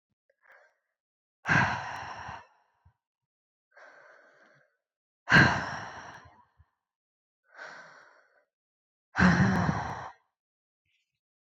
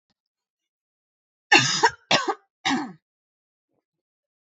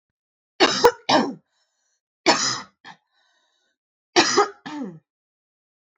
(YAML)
exhalation_length: 11.5 s
exhalation_amplitude: 15091
exhalation_signal_mean_std_ratio: 0.3
cough_length: 4.4 s
cough_amplitude: 26762
cough_signal_mean_std_ratio: 0.3
three_cough_length: 6.0 s
three_cough_amplitude: 28845
three_cough_signal_mean_std_ratio: 0.34
survey_phase: beta (2021-08-13 to 2022-03-07)
age: 18-44
gender: Female
wearing_mask: 'No'
symptom_runny_or_blocked_nose: true
symptom_fatigue: true
symptom_other: true
symptom_onset: 2 days
smoker_status: Never smoked
respiratory_condition_asthma: false
respiratory_condition_other: false
recruitment_source: Test and Trace
submission_delay: 2 days
covid_test_result: Positive
covid_test_method: RT-qPCR
covid_ct_value: 17.8
covid_ct_gene: ORF1ab gene
covid_ct_mean: 18.1
covid_viral_load: 1200000 copies/ml
covid_viral_load_category: High viral load (>1M copies/ml)